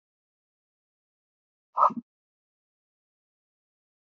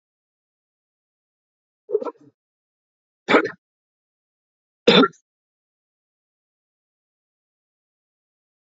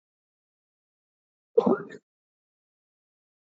{"exhalation_length": "4.0 s", "exhalation_amplitude": 13570, "exhalation_signal_mean_std_ratio": 0.14, "three_cough_length": "8.8 s", "three_cough_amplitude": 30258, "three_cough_signal_mean_std_ratio": 0.17, "cough_length": "3.6 s", "cough_amplitude": 14202, "cough_signal_mean_std_ratio": 0.17, "survey_phase": "beta (2021-08-13 to 2022-03-07)", "age": "45-64", "gender": "Male", "wearing_mask": "No", "symptom_none": true, "smoker_status": "Never smoked", "respiratory_condition_asthma": false, "respiratory_condition_other": false, "recruitment_source": "Test and Trace", "submission_delay": "0 days", "covid_test_result": "Negative", "covid_test_method": "LFT"}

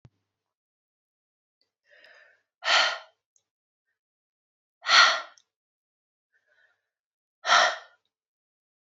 {"exhalation_length": "9.0 s", "exhalation_amplitude": 19249, "exhalation_signal_mean_std_ratio": 0.24, "survey_phase": "beta (2021-08-13 to 2022-03-07)", "age": "18-44", "gender": "Female", "wearing_mask": "No", "symptom_none": true, "smoker_status": "Never smoked", "respiratory_condition_asthma": false, "respiratory_condition_other": false, "recruitment_source": "REACT", "submission_delay": "1 day", "covid_test_result": "Negative", "covid_test_method": "RT-qPCR", "influenza_a_test_result": "Unknown/Void", "influenza_b_test_result": "Unknown/Void"}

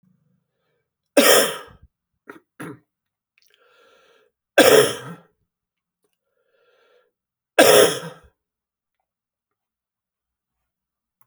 {"three_cough_length": "11.3 s", "three_cough_amplitude": 32767, "three_cough_signal_mean_std_ratio": 0.25, "survey_phase": "beta (2021-08-13 to 2022-03-07)", "age": "65+", "gender": "Male", "wearing_mask": "No", "symptom_cough_any": true, "symptom_runny_or_blocked_nose": true, "symptom_fever_high_temperature": true, "symptom_headache": true, "symptom_onset": "3 days", "smoker_status": "Never smoked", "respiratory_condition_asthma": false, "respiratory_condition_other": false, "recruitment_source": "Test and Trace", "submission_delay": "2 days", "covid_test_result": "Positive", "covid_test_method": "RT-qPCR"}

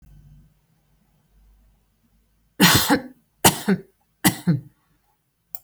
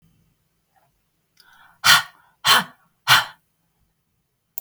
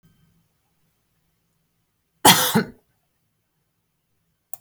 {"three_cough_length": "5.6 s", "three_cough_amplitude": 32768, "three_cough_signal_mean_std_ratio": 0.31, "exhalation_length": "4.6 s", "exhalation_amplitude": 32768, "exhalation_signal_mean_std_ratio": 0.26, "cough_length": "4.6 s", "cough_amplitude": 32768, "cough_signal_mean_std_ratio": 0.21, "survey_phase": "beta (2021-08-13 to 2022-03-07)", "age": "45-64", "gender": "Female", "wearing_mask": "No", "symptom_none": true, "smoker_status": "Never smoked", "respiratory_condition_asthma": false, "respiratory_condition_other": false, "recruitment_source": "REACT", "submission_delay": "2 days", "covid_test_result": "Negative", "covid_test_method": "RT-qPCR"}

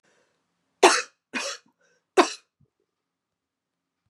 {"three_cough_length": "4.1 s", "three_cough_amplitude": 27568, "three_cough_signal_mean_std_ratio": 0.22, "survey_phase": "beta (2021-08-13 to 2022-03-07)", "age": "65+", "gender": "Female", "wearing_mask": "No", "symptom_none": true, "smoker_status": "Never smoked", "respiratory_condition_asthma": true, "respiratory_condition_other": false, "recruitment_source": "REACT", "submission_delay": "3 days", "covid_test_result": "Negative", "covid_test_method": "RT-qPCR", "influenza_a_test_result": "Unknown/Void", "influenza_b_test_result": "Unknown/Void"}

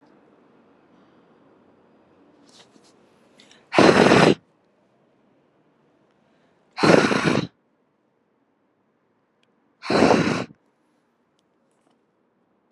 {"exhalation_length": "12.7 s", "exhalation_amplitude": 32174, "exhalation_signal_mean_std_ratio": 0.28, "survey_phase": "beta (2021-08-13 to 2022-03-07)", "age": "18-44", "gender": "Female", "wearing_mask": "No", "symptom_cough_any": true, "symptom_new_continuous_cough": true, "smoker_status": "Never smoked", "respiratory_condition_asthma": false, "respiratory_condition_other": false, "recruitment_source": "REACT", "submission_delay": "0 days", "covid_test_result": "Negative", "covid_test_method": "RT-qPCR", "influenza_a_test_result": "Negative", "influenza_b_test_result": "Negative"}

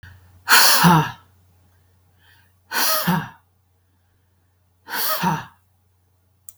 {"exhalation_length": "6.6 s", "exhalation_amplitude": 32768, "exhalation_signal_mean_std_ratio": 0.38, "survey_phase": "beta (2021-08-13 to 2022-03-07)", "age": "45-64", "gender": "Female", "wearing_mask": "No", "symptom_none": true, "smoker_status": "Never smoked", "respiratory_condition_asthma": false, "respiratory_condition_other": false, "recruitment_source": "REACT", "submission_delay": "2 days", "covid_test_result": "Negative", "covid_test_method": "RT-qPCR", "influenza_a_test_result": "Negative", "influenza_b_test_result": "Negative"}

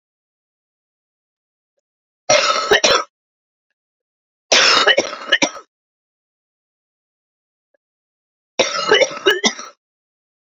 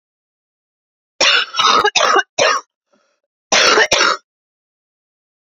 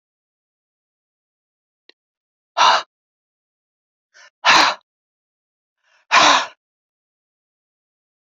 {"three_cough_length": "10.6 s", "three_cough_amplitude": 32767, "three_cough_signal_mean_std_ratio": 0.34, "cough_length": "5.5 s", "cough_amplitude": 32767, "cough_signal_mean_std_ratio": 0.46, "exhalation_length": "8.4 s", "exhalation_amplitude": 31986, "exhalation_signal_mean_std_ratio": 0.25, "survey_phase": "beta (2021-08-13 to 2022-03-07)", "age": "45-64", "gender": "Female", "wearing_mask": "No", "symptom_cough_any": true, "symptom_runny_or_blocked_nose": true, "symptom_shortness_of_breath": true, "symptom_sore_throat": true, "symptom_headache": true, "smoker_status": "Never smoked", "respiratory_condition_asthma": true, "respiratory_condition_other": false, "recruitment_source": "REACT", "submission_delay": "15 days", "covid_test_result": "Negative", "covid_test_method": "RT-qPCR"}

